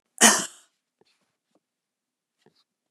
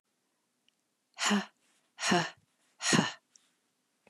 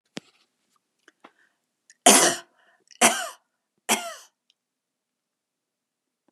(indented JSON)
{
  "cough_length": "2.9 s",
  "cough_amplitude": 29739,
  "cough_signal_mean_std_ratio": 0.2,
  "exhalation_length": "4.1 s",
  "exhalation_amplitude": 8609,
  "exhalation_signal_mean_std_ratio": 0.35,
  "three_cough_length": "6.3 s",
  "three_cough_amplitude": 32060,
  "three_cough_signal_mean_std_ratio": 0.23,
  "survey_phase": "beta (2021-08-13 to 2022-03-07)",
  "age": "65+",
  "gender": "Female",
  "wearing_mask": "No",
  "symptom_other": true,
  "smoker_status": "Never smoked",
  "respiratory_condition_asthma": false,
  "respiratory_condition_other": false,
  "recruitment_source": "REACT",
  "submission_delay": "3 days",
  "covid_test_result": "Negative",
  "covid_test_method": "RT-qPCR",
  "influenza_a_test_result": "Negative",
  "influenza_b_test_result": "Negative"
}